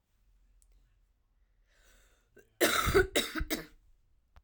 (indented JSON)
{
  "cough_length": "4.4 s",
  "cough_amplitude": 7408,
  "cough_signal_mean_std_ratio": 0.33,
  "survey_phase": "beta (2021-08-13 to 2022-03-07)",
  "age": "18-44",
  "gender": "Female",
  "wearing_mask": "No",
  "symptom_cough_any": true,
  "symptom_runny_or_blocked_nose": true,
  "symptom_sore_throat": true,
  "symptom_fatigue": true,
  "symptom_onset": "4 days",
  "smoker_status": "Ex-smoker",
  "respiratory_condition_asthma": false,
  "respiratory_condition_other": false,
  "recruitment_source": "Test and Trace",
  "submission_delay": "2 days",
  "covid_test_result": "Positive",
  "covid_test_method": "ePCR"
}